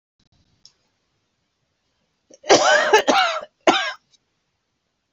{"cough_length": "5.1 s", "cough_amplitude": 28802, "cough_signal_mean_std_ratio": 0.35, "survey_phase": "beta (2021-08-13 to 2022-03-07)", "age": "65+", "gender": "Female", "wearing_mask": "No", "symptom_runny_or_blocked_nose": true, "symptom_diarrhoea": true, "symptom_headache": true, "symptom_onset": "12 days", "smoker_status": "Ex-smoker", "respiratory_condition_asthma": true, "respiratory_condition_other": false, "recruitment_source": "REACT", "submission_delay": "1 day", "covid_test_result": "Negative", "covid_test_method": "RT-qPCR", "influenza_a_test_result": "Negative", "influenza_b_test_result": "Negative"}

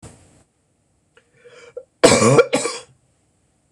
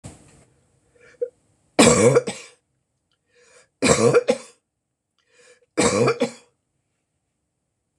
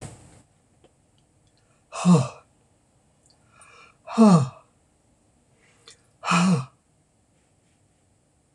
{"cough_length": "3.7 s", "cough_amplitude": 26028, "cough_signal_mean_std_ratio": 0.32, "three_cough_length": "8.0 s", "three_cough_amplitude": 26027, "three_cough_signal_mean_std_ratio": 0.34, "exhalation_length": "8.5 s", "exhalation_amplitude": 20417, "exhalation_signal_mean_std_ratio": 0.28, "survey_phase": "beta (2021-08-13 to 2022-03-07)", "age": "65+", "gender": "Female", "wearing_mask": "No", "symptom_cough_any": true, "smoker_status": "Never smoked", "respiratory_condition_asthma": false, "respiratory_condition_other": false, "recruitment_source": "REACT", "submission_delay": "1 day", "covid_test_result": "Negative", "covid_test_method": "RT-qPCR", "influenza_a_test_result": "Negative", "influenza_b_test_result": "Negative"}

